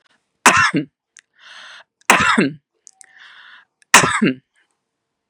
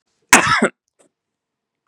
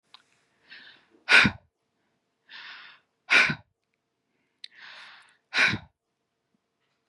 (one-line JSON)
{"three_cough_length": "5.3 s", "three_cough_amplitude": 32768, "three_cough_signal_mean_std_ratio": 0.36, "cough_length": "1.9 s", "cough_amplitude": 32768, "cough_signal_mean_std_ratio": 0.31, "exhalation_length": "7.1 s", "exhalation_amplitude": 23045, "exhalation_signal_mean_std_ratio": 0.25, "survey_phase": "beta (2021-08-13 to 2022-03-07)", "age": "45-64", "gender": "Female", "wearing_mask": "No", "symptom_none": true, "smoker_status": "Never smoked", "respiratory_condition_asthma": false, "respiratory_condition_other": false, "recruitment_source": "REACT", "submission_delay": "2 days", "covid_test_result": "Negative", "covid_test_method": "RT-qPCR", "influenza_a_test_result": "Negative", "influenza_b_test_result": "Positive", "influenza_b_ct_value": 31.7}